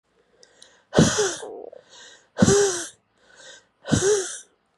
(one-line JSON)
{"exhalation_length": "4.8 s", "exhalation_amplitude": 23580, "exhalation_signal_mean_std_ratio": 0.43, "survey_phase": "beta (2021-08-13 to 2022-03-07)", "age": "18-44", "gender": "Female", "wearing_mask": "No", "symptom_cough_any": true, "symptom_shortness_of_breath": true, "symptom_fatigue": true, "symptom_change_to_sense_of_smell_or_taste": true, "symptom_onset": "5 days", "smoker_status": "Ex-smoker", "respiratory_condition_asthma": true, "respiratory_condition_other": false, "recruitment_source": "Test and Trace", "submission_delay": "2 days", "covid_test_result": "Positive", "covid_test_method": "RT-qPCR", "covid_ct_value": 18.2, "covid_ct_gene": "ORF1ab gene", "covid_ct_mean": 18.7, "covid_viral_load": "730000 copies/ml", "covid_viral_load_category": "Low viral load (10K-1M copies/ml)"}